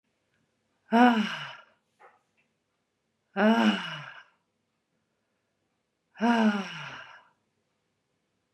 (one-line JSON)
{"exhalation_length": "8.5 s", "exhalation_amplitude": 16267, "exhalation_signal_mean_std_ratio": 0.33, "survey_phase": "beta (2021-08-13 to 2022-03-07)", "age": "45-64", "gender": "Female", "wearing_mask": "No", "symptom_none": true, "smoker_status": "Never smoked", "respiratory_condition_asthma": false, "respiratory_condition_other": false, "recruitment_source": "REACT", "submission_delay": "2 days", "covid_test_result": "Negative", "covid_test_method": "RT-qPCR", "influenza_a_test_result": "Negative", "influenza_b_test_result": "Negative"}